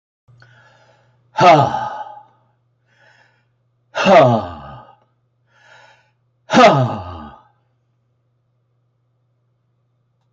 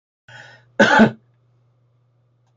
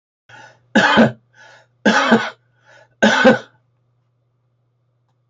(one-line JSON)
{"exhalation_length": "10.3 s", "exhalation_amplitude": 29670, "exhalation_signal_mean_std_ratio": 0.31, "cough_length": "2.6 s", "cough_amplitude": 26977, "cough_signal_mean_std_ratio": 0.29, "three_cough_length": "5.3 s", "three_cough_amplitude": 28451, "three_cough_signal_mean_std_ratio": 0.38, "survey_phase": "beta (2021-08-13 to 2022-03-07)", "age": "65+", "gender": "Male", "wearing_mask": "No", "symptom_none": true, "smoker_status": "Ex-smoker", "respiratory_condition_asthma": false, "respiratory_condition_other": false, "recruitment_source": "REACT", "submission_delay": "1 day", "covid_test_result": "Negative", "covid_test_method": "RT-qPCR"}